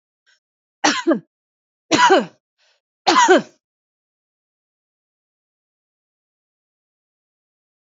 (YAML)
three_cough_length: 7.9 s
three_cough_amplitude: 26664
three_cough_signal_mean_std_ratio: 0.27
survey_phase: beta (2021-08-13 to 2022-03-07)
age: 45-64
gender: Female
wearing_mask: 'No'
symptom_cough_any: true
symptom_runny_or_blocked_nose: true
symptom_headache: true
symptom_other: true
symptom_onset: 2 days
smoker_status: Ex-smoker
respiratory_condition_asthma: false
respiratory_condition_other: false
recruitment_source: Test and Trace
submission_delay: 2 days
covid_test_result: Positive
covid_test_method: RT-qPCR
covid_ct_value: 24.1
covid_ct_gene: ORF1ab gene
covid_ct_mean: 24.5
covid_viral_load: 9500 copies/ml
covid_viral_load_category: Minimal viral load (< 10K copies/ml)